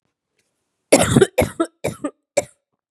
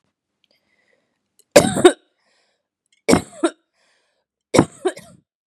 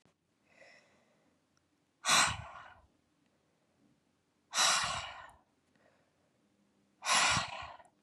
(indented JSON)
{
  "cough_length": "2.9 s",
  "cough_amplitude": 32768,
  "cough_signal_mean_std_ratio": 0.34,
  "three_cough_length": "5.5 s",
  "three_cough_amplitude": 32768,
  "three_cough_signal_mean_std_ratio": 0.24,
  "exhalation_length": "8.0 s",
  "exhalation_amplitude": 6792,
  "exhalation_signal_mean_std_ratio": 0.34,
  "survey_phase": "beta (2021-08-13 to 2022-03-07)",
  "age": "18-44",
  "gender": "Female",
  "wearing_mask": "No",
  "symptom_runny_or_blocked_nose": true,
  "symptom_shortness_of_breath": true,
  "symptom_headache": true,
  "smoker_status": "Never smoked",
  "respiratory_condition_asthma": false,
  "respiratory_condition_other": false,
  "recruitment_source": "Test and Trace",
  "submission_delay": "2 days",
  "covid_test_result": "Positive",
  "covid_test_method": "LFT"
}